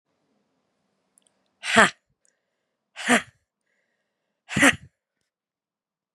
{"exhalation_length": "6.1 s", "exhalation_amplitude": 32767, "exhalation_signal_mean_std_ratio": 0.22, "survey_phase": "beta (2021-08-13 to 2022-03-07)", "age": "45-64", "gender": "Female", "wearing_mask": "No", "symptom_cough_any": true, "symptom_runny_or_blocked_nose": true, "symptom_shortness_of_breath": true, "symptom_sore_throat": true, "symptom_fatigue": true, "symptom_headache": true, "symptom_change_to_sense_of_smell_or_taste": true, "symptom_loss_of_taste": true, "symptom_onset": "3 days", "smoker_status": "Never smoked", "respiratory_condition_asthma": true, "respiratory_condition_other": false, "recruitment_source": "Test and Trace", "submission_delay": "2 days", "covid_test_result": "Positive", "covid_test_method": "RT-qPCR", "covid_ct_value": 15.1, "covid_ct_gene": "S gene", "covid_ct_mean": 15.4, "covid_viral_load": "8800000 copies/ml", "covid_viral_load_category": "High viral load (>1M copies/ml)"}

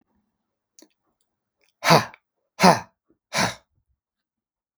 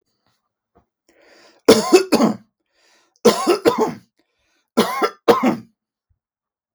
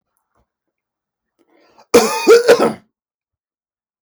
{"exhalation_length": "4.8 s", "exhalation_amplitude": 32766, "exhalation_signal_mean_std_ratio": 0.23, "three_cough_length": "6.7 s", "three_cough_amplitude": 32768, "three_cough_signal_mean_std_ratio": 0.37, "cough_length": "4.0 s", "cough_amplitude": 32768, "cough_signal_mean_std_ratio": 0.32, "survey_phase": "beta (2021-08-13 to 2022-03-07)", "age": "45-64", "gender": "Male", "wearing_mask": "No", "symptom_none": true, "smoker_status": "Ex-smoker", "respiratory_condition_asthma": false, "respiratory_condition_other": false, "recruitment_source": "REACT", "submission_delay": "12 days", "covid_test_result": "Negative", "covid_test_method": "RT-qPCR"}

